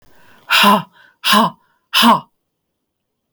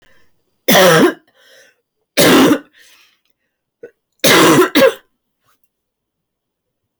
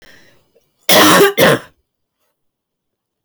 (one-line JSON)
{"exhalation_length": "3.3 s", "exhalation_amplitude": 32768, "exhalation_signal_mean_std_ratio": 0.42, "three_cough_length": "7.0 s", "three_cough_amplitude": 32767, "three_cough_signal_mean_std_ratio": 0.42, "cough_length": "3.2 s", "cough_amplitude": 32768, "cough_signal_mean_std_ratio": 0.4, "survey_phase": "beta (2021-08-13 to 2022-03-07)", "age": "18-44", "gender": "Female", "wearing_mask": "No", "symptom_cough_any": true, "symptom_runny_or_blocked_nose": true, "smoker_status": "Ex-smoker", "respiratory_condition_asthma": true, "respiratory_condition_other": false, "recruitment_source": "REACT", "submission_delay": "1 day", "covid_test_result": "Negative", "covid_test_method": "RT-qPCR"}